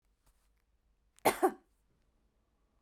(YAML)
cough_length: 2.8 s
cough_amplitude: 6404
cough_signal_mean_std_ratio: 0.2
survey_phase: beta (2021-08-13 to 2022-03-07)
age: 45-64
gender: Female
wearing_mask: 'No'
symptom_none: true
smoker_status: Never smoked
respiratory_condition_asthma: false
respiratory_condition_other: false
recruitment_source: REACT
submission_delay: 1 day
covid_test_result: Negative
covid_test_method: RT-qPCR